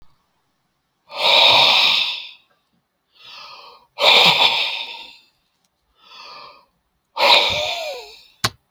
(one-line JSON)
{"exhalation_length": "8.7 s", "exhalation_amplitude": 32768, "exhalation_signal_mean_std_ratio": 0.45, "survey_phase": "beta (2021-08-13 to 2022-03-07)", "age": "65+", "gender": "Male", "wearing_mask": "No", "symptom_none": true, "smoker_status": "Ex-smoker", "respiratory_condition_asthma": false, "respiratory_condition_other": false, "recruitment_source": "REACT", "submission_delay": "2 days", "covid_test_result": "Negative", "covid_test_method": "RT-qPCR"}